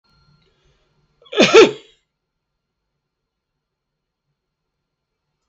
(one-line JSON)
{"cough_length": "5.5 s", "cough_amplitude": 32768, "cough_signal_mean_std_ratio": 0.19, "survey_phase": "beta (2021-08-13 to 2022-03-07)", "age": "65+", "gender": "Male", "wearing_mask": "No", "symptom_none": true, "smoker_status": "Never smoked", "respiratory_condition_asthma": true, "respiratory_condition_other": false, "recruitment_source": "REACT", "submission_delay": "2 days", "covid_test_result": "Negative", "covid_test_method": "RT-qPCR", "influenza_a_test_result": "Unknown/Void", "influenza_b_test_result": "Unknown/Void"}